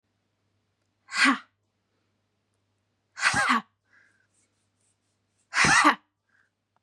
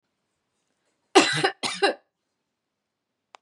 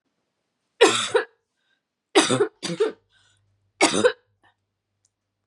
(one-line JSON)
{"exhalation_length": "6.8 s", "exhalation_amplitude": 17673, "exhalation_signal_mean_std_ratio": 0.31, "cough_length": "3.4 s", "cough_amplitude": 28690, "cough_signal_mean_std_ratio": 0.28, "three_cough_length": "5.5 s", "three_cough_amplitude": 27625, "three_cough_signal_mean_std_ratio": 0.34, "survey_phase": "beta (2021-08-13 to 2022-03-07)", "age": "18-44", "gender": "Female", "wearing_mask": "No", "symptom_cough_any": true, "smoker_status": "Ex-smoker", "respiratory_condition_asthma": false, "respiratory_condition_other": false, "recruitment_source": "REACT", "submission_delay": "12 days", "covid_test_result": "Negative", "covid_test_method": "RT-qPCR", "influenza_a_test_result": "Negative", "influenza_b_test_result": "Negative"}